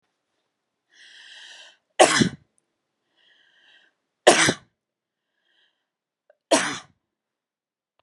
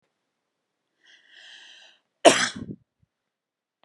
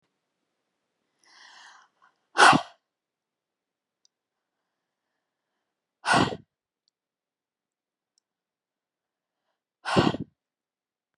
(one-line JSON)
{"three_cough_length": "8.0 s", "three_cough_amplitude": 31159, "three_cough_signal_mean_std_ratio": 0.23, "cough_length": "3.8 s", "cough_amplitude": 30866, "cough_signal_mean_std_ratio": 0.19, "exhalation_length": "11.2 s", "exhalation_amplitude": 22944, "exhalation_signal_mean_std_ratio": 0.19, "survey_phase": "beta (2021-08-13 to 2022-03-07)", "age": "45-64", "gender": "Female", "wearing_mask": "No", "symptom_sore_throat": true, "symptom_fatigue": true, "symptom_onset": "12 days", "smoker_status": "Never smoked", "respiratory_condition_asthma": false, "respiratory_condition_other": false, "recruitment_source": "REACT", "submission_delay": "1 day", "covid_test_result": "Negative", "covid_test_method": "RT-qPCR"}